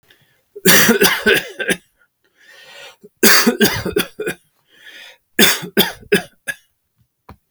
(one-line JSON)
{"three_cough_length": "7.5 s", "three_cough_amplitude": 32768, "three_cough_signal_mean_std_ratio": 0.42, "survey_phase": "beta (2021-08-13 to 2022-03-07)", "age": "65+", "gender": "Male", "wearing_mask": "No", "symptom_none": true, "smoker_status": "Never smoked", "respiratory_condition_asthma": false, "respiratory_condition_other": false, "recruitment_source": "REACT", "submission_delay": "2 days", "covid_test_result": "Negative", "covid_test_method": "RT-qPCR"}